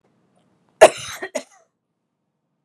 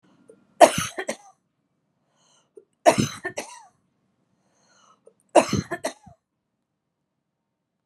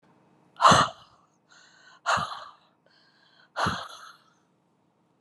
{"cough_length": "2.6 s", "cough_amplitude": 32768, "cough_signal_mean_std_ratio": 0.17, "three_cough_length": "7.9 s", "three_cough_amplitude": 32676, "three_cough_signal_mean_std_ratio": 0.21, "exhalation_length": "5.2 s", "exhalation_amplitude": 21962, "exhalation_signal_mean_std_ratio": 0.28, "survey_phase": "beta (2021-08-13 to 2022-03-07)", "age": "45-64", "gender": "Female", "wearing_mask": "No", "symptom_none": true, "smoker_status": "Never smoked", "respiratory_condition_asthma": true, "respiratory_condition_other": false, "recruitment_source": "REACT", "submission_delay": "1 day", "covid_test_result": "Negative", "covid_test_method": "RT-qPCR", "influenza_a_test_result": "Negative", "influenza_b_test_result": "Negative"}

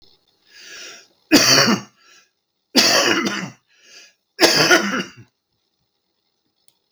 {"three_cough_length": "6.9 s", "three_cough_amplitude": 32768, "three_cough_signal_mean_std_ratio": 0.41, "survey_phase": "beta (2021-08-13 to 2022-03-07)", "age": "65+", "gender": "Male", "wearing_mask": "No", "symptom_none": true, "smoker_status": "Ex-smoker", "respiratory_condition_asthma": false, "respiratory_condition_other": true, "recruitment_source": "REACT", "submission_delay": "3 days", "covid_test_result": "Negative", "covid_test_method": "RT-qPCR", "influenza_a_test_result": "Negative", "influenza_b_test_result": "Negative"}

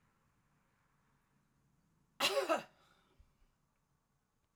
{"cough_length": "4.6 s", "cough_amplitude": 3569, "cough_signal_mean_std_ratio": 0.24, "survey_phase": "alpha (2021-03-01 to 2021-08-12)", "age": "45-64", "gender": "Female", "wearing_mask": "No", "symptom_none": true, "smoker_status": "Current smoker (e-cigarettes or vapes only)", "respiratory_condition_asthma": false, "respiratory_condition_other": false, "recruitment_source": "REACT", "submission_delay": "1 day", "covid_test_result": "Negative", "covid_test_method": "RT-qPCR"}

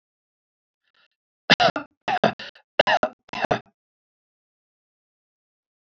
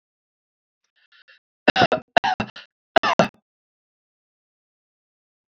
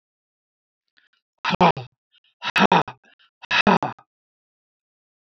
{"cough_length": "5.9 s", "cough_amplitude": 28377, "cough_signal_mean_std_ratio": 0.25, "three_cough_length": "5.5 s", "three_cough_amplitude": 29071, "three_cough_signal_mean_std_ratio": 0.23, "exhalation_length": "5.4 s", "exhalation_amplitude": 26486, "exhalation_signal_mean_std_ratio": 0.29, "survey_phase": "alpha (2021-03-01 to 2021-08-12)", "age": "65+", "gender": "Male", "wearing_mask": "No", "symptom_none": true, "smoker_status": "Never smoked", "respiratory_condition_asthma": false, "respiratory_condition_other": false, "recruitment_source": "REACT", "submission_delay": "2 days", "covid_test_result": "Negative", "covid_test_method": "RT-qPCR"}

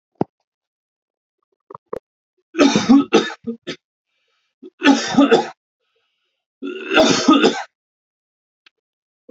{"three_cough_length": "9.3 s", "three_cough_amplitude": 30092, "three_cough_signal_mean_std_ratio": 0.36, "survey_phase": "alpha (2021-03-01 to 2021-08-12)", "age": "18-44", "gender": "Male", "wearing_mask": "No", "symptom_diarrhoea": true, "symptom_fatigue": true, "symptom_headache": true, "symptom_change_to_sense_of_smell_or_taste": true, "symptom_loss_of_taste": true, "smoker_status": "Never smoked", "respiratory_condition_asthma": false, "respiratory_condition_other": false, "recruitment_source": "Test and Trace", "submission_delay": "2 days", "covid_test_result": "Positive", "covid_test_method": "RT-qPCR"}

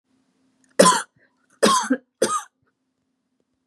{"three_cough_length": "3.7 s", "three_cough_amplitude": 32077, "three_cough_signal_mean_std_ratio": 0.33, "survey_phase": "beta (2021-08-13 to 2022-03-07)", "age": "18-44", "gender": "Female", "wearing_mask": "No", "symptom_cough_any": true, "smoker_status": "Never smoked", "respiratory_condition_asthma": false, "respiratory_condition_other": false, "recruitment_source": "REACT", "submission_delay": "1 day", "covid_test_result": "Negative", "covid_test_method": "RT-qPCR", "influenza_a_test_result": "Negative", "influenza_b_test_result": "Negative"}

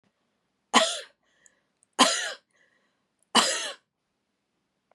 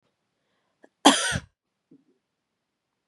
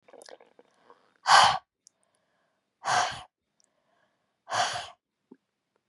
{"three_cough_length": "4.9 s", "three_cough_amplitude": 27984, "three_cough_signal_mean_std_ratio": 0.29, "cough_length": "3.1 s", "cough_amplitude": 31898, "cough_signal_mean_std_ratio": 0.21, "exhalation_length": "5.9 s", "exhalation_amplitude": 19289, "exhalation_signal_mean_std_ratio": 0.28, "survey_phase": "beta (2021-08-13 to 2022-03-07)", "age": "18-44", "gender": "Female", "wearing_mask": "No", "symptom_shortness_of_breath": true, "symptom_fatigue": true, "symptom_headache": true, "symptom_change_to_sense_of_smell_or_taste": true, "symptom_other": true, "symptom_onset": "2 days", "smoker_status": "Never smoked", "respiratory_condition_asthma": false, "respiratory_condition_other": false, "recruitment_source": "Test and Trace", "submission_delay": "1 day", "covid_test_result": "Positive", "covid_test_method": "RT-qPCR", "covid_ct_value": 22.4, "covid_ct_gene": "ORF1ab gene", "covid_ct_mean": 23.1, "covid_viral_load": "26000 copies/ml", "covid_viral_load_category": "Low viral load (10K-1M copies/ml)"}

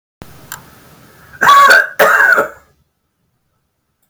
{"cough_length": "4.1 s", "cough_amplitude": 32768, "cough_signal_mean_std_ratio": 0.43, "survey_phase": "beta (2021-08-13 to 2022-03-07)", "age": "65+", "gender": "Male", "wearing_mask": "No", "symptom_none": true, "smoker_status": "Never smoked", "respiratory_condition_asthma": true, "respiratory_condition_other": false, "recruitment_source": "REACT", "submission_delay": "2 days", "covid_test_result": "Negative", "covid_test_method": "RT-qPCR", "influenza_a_test_result": "Negative", "influenza_b_test_result": "Negative"}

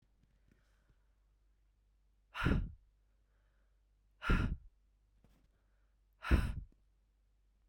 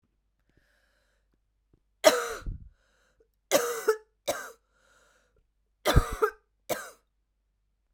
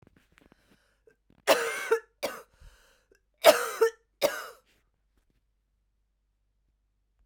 {"exhalation_length": "7.7 s", "exhalation_amplitude": 5078, "exhalation_signal_mean_std_ratio": 0.28, "three_cough_length": "7.9 s", "three_cough_amplitude": 21174, "three_cough_signal_mean_std_ratio": 0.28, "cough_length": "7.3 s", "cough_amplitude": 22355, "cough_signal_mean_std_ratio": 0.25, "survey_phase": "beta (2021-08-13 to 2022-03-07)", "age": "45-64", "gender": "Female", "wearing_mask": "No", "symptom_cough_any": true, "symptom_onset": "12 days", "smoker_status": "Ex-smoker", "respiratory_condition_asthma": false, "respiratory_condition_other": false, "recruitment_source": "REACT", "submission_delay": "2 days", "covid_test_result": "Negative", "covid_test_method": "RT-qPCR"}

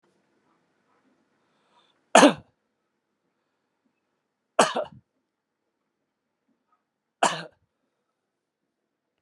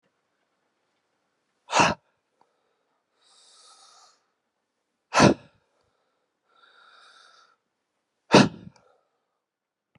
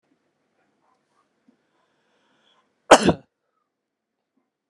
{"three_cough_length": "9.2 s", "three_cough_amplitude": 31288, "three_cough_signal_mean_std_ratio": 0.16, "exhalation_length": "10.0 s", "exhalation_amplitude": 29292, "exhalation_signal_mean_std_ratio": 0.19, "cough_length": "4.7 s", "cough_amplitude": 32768, "cough_signal_mean_std_ratio": 0.14, "survey_phase": "beta (2021-08-13 to 2022-03-07)", "age": "65+", "gender": "Male", "wearing_mask": "No", "symptom_none": true, "smoker_status": "Never smoked", "respiratory_condition_asthma": false, "respiratory_condition_other": false, "recruitment_source": "REACT", "submission_delay": "4 days", "covid_test_result": "Negative", "covid_test_method": "RT-qPCR"}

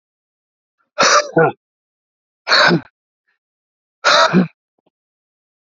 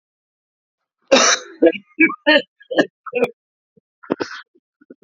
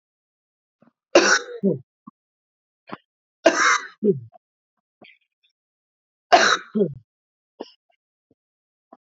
{"exhalation_length": "5.7 s", "exhalation_amplitude": 31086, "exhalation_signal_mean_std_ratio": 0.37, "cough_length": "5.0 s", "cough_amplitude": 31050, "cough_signal_mean_std_ratio": 0.35, "three_cough_length": "9.0 s", "three_cough_amplitude": 32767, "three_cough_signal_mean_std_ratio": 0.29, "survey_phase": "beta (2021-08-13 to 2022-03-07)", "age": "45-64", "gender": "Male", "wearing_mask": "No", "symptom_cough_any": true, "symptom_runny_or_blocked_nose": true, "symptom_shortness_of_breath": true, "symptom_sore_throat": true, "symptom_fatigue": true, "symptom_headache": true, "symptom_onset": "2 days", "smoker_status": "Ex-smoker", "respiratory_condition_asthma": true, "respiratory_condition_other": false, "recruitment_source": "Test and Trace", "submission_delay": "1 day", "covid_test_result": "Positive", "covid_test_method": "RT-qPCR", "covid_ct_value": 20.6, "covid_ct_gene": "ORF1ab gene", "covid_ct_mean": 20.8, "covid_viral_load": "150000 copies/ml", "covid_viral_load_category": "Low viral load (10K-1M copies/ml)"}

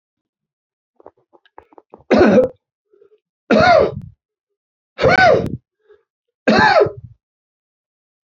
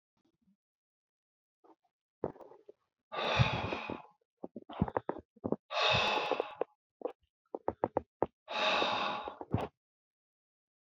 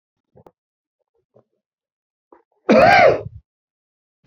{"three_cough_length": "8.4 s", "three_cough_amplitude": 30758, "three_cough_signal_mean_std_ratio": 0.38, "exhalation_length": "10.8 s", "exhalation_amplitude": 7491, "exhalation_signal_mean_std_ratio": 0.41, "cough_length": "4.3 s", "cough_amplitude": 27717, "cough_signal_mean_std_ratio": 0.29, "survey_phase": "beta (2021-08-13 to 2022-03-07)", "age": "65+", "gender": "Male", "wearing_mask": "No", "symptom_none": true, "smoker_status": "Never smoked", "respiratory_condition_asthma": false, "respiratory_condition_other": false, "recruitment_source": "REACT", "submission_delay": "2 days", "covid_test_result": "Negative", "covid_test_method": "RT-qPCR", "influenza_a_test_result": "Negative", "influenza_b_test_result": "Negative"}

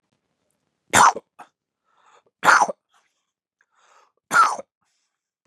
{"three_cough_length": "5.5 s", "three_cough_amplitude": 30461, "three_cough_signal_mean_std_ratio": 0.27, "survey_phase": "beta (2021-08-13 to 2022-03-07)", "age": "45-64", "gender": "Male", "wearing_mask": "No", "symptom_none": true, "smoker_status": "Never smoked", "respiratory_condition_asthma": false, "respiratory_condition_other": false, "recruitment_source": "REACT", "submission_delay": "1 day", "covid_test_result": "Negative", "covid_test_method": "RT-qPCR", "influenza_a_test_result": "Negative", "influenza_b_test_result": "Negative"}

